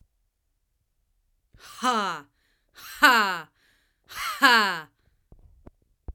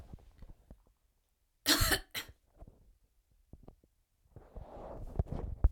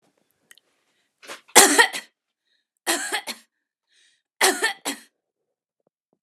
exhalation_length: 6.1 s
exhalation_amplitude: 26779
exhalation_signal_mean_std_ratio: 0.33
cough_length: 5.7 s
cough_amplitude: 7801
cough_signal_mean_std_ratio: 0.31
three_cough_length: 6.2 s
three_cough_amplitude: 32768
three_cough_signal_mean_std_ratio: 0.27
survey_phase: alpha (2021-03-01 to 2021-08-12)
age: 18-44
gender: Female
wearing_mask: 'No'
symptom_none: true
smoker_status: Never smoked
respiratory_condition_asthma: false
respiratory_condition_other: false
recruitment_source: REACT
submission_delay: 1 day
covid_test_result: Negative
covid_test_method: RT-qPCR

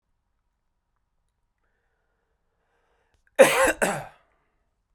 cough_length: 4.9 s
cough_amplitude: 28269
cough_signal_mean_std_ratio: 0.22
survey_phase: beta (2021-08-13 to 2022-03-07)
age: 18-44
gender: Male
wearing_mask: 'No'
symptom_none: true
smoker_status: Never smoked
respiratory_condition_asthma: false
respiratory_condition_other: false
recruitment_source: REACT
submission_delay: 0 days
covid_test_result: Negative
covid_test_method: RT-qPCR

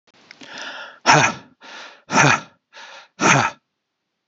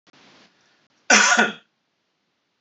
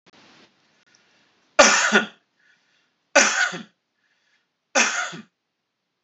exhalation_length: 4.3 s
exhalation_amplitude: 30760
exhalation_signal_mean_std_ratio: 0.39
cough_length: 2.6 s
cough_amplitude: 31382
cough_signal_mean_std_ratio: 0.32
three_cough_length: 6.0 s
three_cough_amplitude: 29420
three_cough_signal_mean_std_ratio: 0.32
survey_phase: alpha (2021-03-01 to 2021-08-12)
age: 45-64
gender: Male
wearing_mask: 'No'
symptom_none: true
smoker_status: Ex-smoker
respiratory_condition_asthma: false
respiratory_condition_other: false
recruitment_source: REACT
submission_delay: 5 days
covid_test_result: Negative
covid_test_method: RT-qPCR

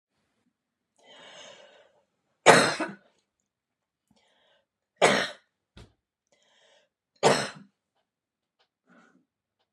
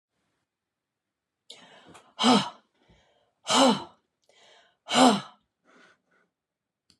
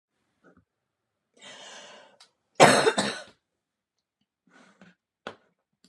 three_cough_length: 9.7 s
three_cough_amplitude: 29615
three_cough_signal_mean_std_ratio: 0.22
exhalation_length: 7.0 s
exhalation_amplitude: 16473
exhalation_signal_mean_std_ratio: 0.28
cough_length: 5.9 s
cough_amplitude: 27257
cough_signal_mean_std_ratio: 0.22
survey_phase: beta (2021-08-13 to 2022-03-07)
age: 45-64
gender: Female
wearing_mask: 'No'
symptom_none: true
smoker_status: Never smoked
respiratory_condition_asthma: false
respiratory_condition_other: false
recruitment_source: REACT
submission_delay: 3 days
covid_test_result: Negative
covid_test_method: RT-qPCR
influenza_a_test_result: Unknown/Void
influenza_b_test_result: Unknown/Void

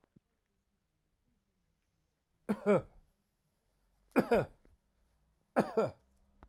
three_cough_length: 6.5 s
three_cough_amplitude: 6553
three_cough_signal_mean_std_ratio: 0.27
survey_phase: alpha (2021-03-01 to 2021-08-12)
age: 45-64
gender: Male
wearing_mask: 'No'
symptom_none: true
smoker_status: Never smoked
respiratory_condition_asthma: false
respiratory_condition_other: false
recruitment_source: REACT
submission_delay: 2 days
covid_test_result: Negative
covid_test_method: RT-qPCR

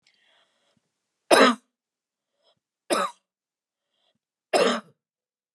three_cough_length: 5.5 s
three_cough_amplitude: 28715
three_cough_signal_mean_std_ratio: 0.26
survey_phase: beta (2021-08-13 to 2022-03-07)
age: 65+
gender: Female
wearing_mask: 'No'
symptom_headache: true
smoker_status: Ex-smoker
respiratory_condition_asthma: false
respiratory_condition_other: false
recruitment_source: REACT
submission_delay: 1 day
covid_test_result: Negative
covid_test_method: RT-qPCR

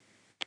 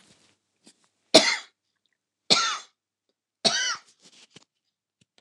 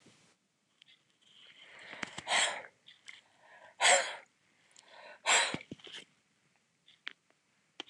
cough_length: 0.5 s
cough_amplitude: 5533
cough_signal_mean_std_ratio: 0.19
three_cough_length: 5.2 s
three_cough_amplitude: 29204
three_cough_signal_mean_std_ratio: 0.26
exhalation_length: 7.9 s
exhalation_amplitude: 8173
exhalation_signal_mean_std_ratio: 0.3
survey_phase: beta (2021-08-13 to 2022-03-07)
age: 65+
gender: Female
wearing_mask: 'No'
symptom_none: true
smoker_status: Never smoked
respiratory_condition_asthma: false
respiratory_condition_other: false
recruitment_source: REACT
submission_delay: 2 days
covid_test_result: Negative
covid_test_method: RT-qPCR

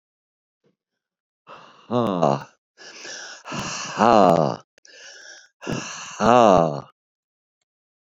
exhalation_length: 8.1 s
exhalation_amplitude: 30725
exhalation_signal_mean_std_ratio: 0.36
survey_phase: beta (2021-08-13 to 2022-03-07)
age: 65+
gender: Male
wearing_mask: 'No'
symptom_none: true
smoker_status: Ex-smoker
respiratory_condition_asthma: false
respiratory_condition_other: false
recruitment_source: REACT
submission_delay: 3 days
covid_test_result: Negative
covid_test_method: RT-qPCR
influenza_a_test_result: Negative
influenza_b_test_result: Negative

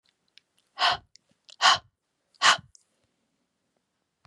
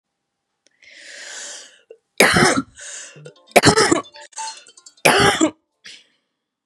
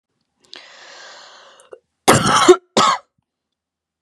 exhalation_length: 4.3 s
exhalation_amplitude: 19394
exhalation_signal_mean_std_ratio: 0.25
three_cough_length: 6.7 s
three_cough_amplitude: 32768
three_cough_signal_mean_std_ratio: 0.38
cough_length: 4.0 s
cough_amplitude: 32768
cough_signal_mean_std_ratio: 0.33
survey_phase: beta (2021-08-13 to 2022-03-07)
age: 18-44
gender: Female
wearing_mask: 'No'
symptom_none: true
smoker_status: Never smoked
respiratory_condition_asthma: true
respiratory_condition_other: false
recruitment_source: REACT
submission_delay: 0 days
covid_test_result: Negative
covid_test_method: RT-qPCR
influenza_a_test_result: Negative
influenza_b_test_result: Negative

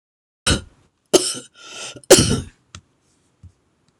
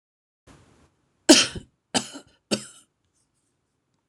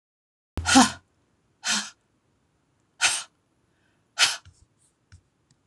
three_cough_length: 4.0 s
three_cough_amplitude: 26028
three_cough_signal_mean_std_ratio: 0.29
cough_length: 4.1 s
cough_amplitude: 26027
cough_signal_mean_std_ratio: 0.2
exhalation_length: 5.7 s
exhalation_amplitude: 26027
exhalation_signal_mean_std_ratio: 0.27
survey_phase: beta (2021-08-13 to 2022-03-07)
age: 65+
gender: Female
wearing_mask: 'No'
symptom_shortness_of_breath: true
symptom_loss_of_taste: true
symptom_onset: 12 days
smoker_status: Ex-smoker
respiratory_condition_asthma: false
respiratory_condition_other: true
recruitment_source: REACT
submission_delay: 3 days
covid_test_result: Negative
covid_test_method: RT-qPCR
influenza_a_test_result: Negative
influenza_b_test_result: Negative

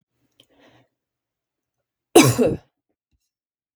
cough_length: 3.8 s
cough_amplitude: 32768
cough_signal_mean_std_ratio: 0.23
survey_phase: beta (2021-08-13 to 2022-03-07)
age: 45-64
gender: Female
wearing_mask: 'No'
symptom_none: true
smoker_status: Never smoked
respiratory_condition_asthma: false
respiratory_condition_other: false
recruitment_source: REACT
submission_delay: 5 days
covid_test_result: Negative
covid_test_method: RT-qPCR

